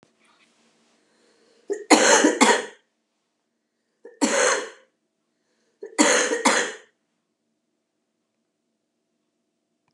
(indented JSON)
{
  "three_cough_length": "9.9 s",
  "three_cough_amplitude": 30779,
  "three_cough_signal_mean_std_ratio": 0.33,
  "survey_phase": "beta (2021-08-13 to 2022-03-07)",
  "age": "65+",
  "gender": "Female",
  "wearing_mask": "No",
  "symptom_cough_any": true,
  "symptom_runny_or_blocked_nose": true,
  "smoker_status": "Never smoked",
  "respiratory_condition_asthma": false,
  "respiratory_condition_other": true,
  "recruitment_source": "REACT",
  "submission_delay": "1 day",
  "covid_test_result": "Negative",
  "covid_test_method": "RT-qPCR",
  "influenza_a_test_result": "Unknown/Void",
  "influenza_b_test_result": "Unknown/Void"
}